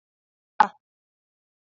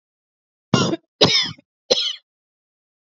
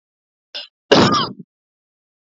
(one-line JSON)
{"exhalation_length": "1.7 s", "exhalation_amplitude": 26290, "exhalation_signal_mean_std_ratio": 0.11, "three_cough_length": "3.2 s", "three_cough_amplitude": 28706, "three_cough_signal_mean_std_ratio": 0.36, "cough_length": "2.3 s", "cough_amplitude": 28928, "cough_signal_mean_std_ratio": 0.33, "survey_phase": "beta (2021-08-13 to 2022-03-07)", "age": "18-44", "gender": "Female", "wearing_mask": "No", "symptom_none": true, "symptom_onset": "3 days", "smoker_status": "Current smoker (e-cigarettes or vapes only)", "respiratory_condition_asthma": false, "respiratory_condition_other": false, "recruitment_source": "REACT", "submission_delay": "4 days", "covid_test_result": "Negative", "covid_test_method": "RT-qPCR"}